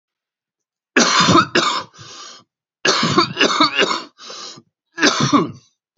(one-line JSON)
{"three_cough_length": "6.0 s", "three_cough_amplitude": 31761, "three_cough_signal_mean_std_ratio": 0.52, "survey_phase": "beta (2021-08-13 to 2022-03-07)", "age": "18-44", "gender": "Male", "wearing_mask": "No", "symptom_shortness_of_breath": true, "symptom_headache": true, "smoker_status": "Current smoker (11 or more cigarettes per day)", "respiratory_condition_asthma": true, "respiratory_condition_other": false, "recruitment_source": "Test and Trace", "submission_delay": "1 day", "covid_test_result": "Positive", "covid_test_method": "LFT"}